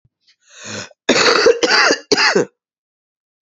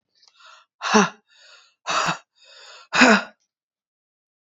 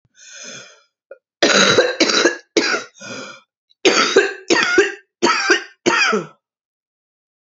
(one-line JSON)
{"cough_length": "3.4 s", "cough_amplitude": 32768, "cough_signal_mean_std_ratio": 0.51, "exhalation_length": "4.4 s", "exhalation_amplitude": 29798, "exhalation_signal_mean_std_ratio": 0.32, "three_cough_length": "7.4 s", "three_cough_amplitude": 32767, "three_cough_signal_mean_std_ratio": 0.52, "survey_phase": "beta (2021-08-13 to 2022-03-07)", "age": "45-64", "gender": "Female", "wearing_mask": "No", "symptom_cough_any": true, "symptom_runny_or_blocked_nose": true, "symptom_shortness_of_breath": true, "symptom_sore_throat": true, "symptom_fatigue": true, "symptom_headache": true, "symptom_onset": "3 days", "smoker_status": "Ex-smoker", "respiratory_condition_asthma": true, "respiratory_condition_other": false, "recruitment_source": "Test and Trace", "submission_delay": "2 days", "covid_test_result": "Positive", "covid_test_method": "ePCR"}